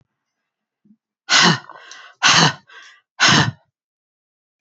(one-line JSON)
{"exhalation_length": "4.6 s", "exhalation_amplitude": 31699, "exhalation_signal_mean_std_ratio": 0.37, "survey_phase": "beta (2021-08-13 to 2022-03-07)", "age": "65+", "gender": "Female", "wearing_mask": "No", "symptom_none": true, "smoker_status": "Ex-smoker", "respiratory_condition_asthma": true, "respiratory_condition_other": false, "recruitment_source": "REACT", "submission_delay": "3 days", "covid_test_result": "Negative", "covid_test_method": "RT-qPCR", "influenza_a_test_result": "Negative", "influenza_b_test_result": "Negative"}